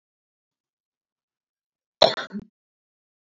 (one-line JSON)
{"cough_length": "3.2 s", "cough_amplitude": 28208, "cough_signal_mean_std_ratio": 0.15, "survey_phase": "beta (2021-08-13 to 2022-03-07)", "age": "18-44", "gender": "Female", "wearing_mask": "No", "symptom_sore_throat": true, "symptom_diarrhoea": true, "symptom_fatigue": true, "symptom_fever_high_temperature": true, "symptom_onset": "3 days", "smoker_status": "Never smoked", "respiratory_condition_asthma": false, "respiratory_condition_other": false, "recruitment_source": "Test and Trace", "submission_delay": "1 day", "covid_test_result": "Positive", "covid_test_method": "RT-qPCR", "covid_ct_value": 35.5, "covid_ct_gene": "N gene"}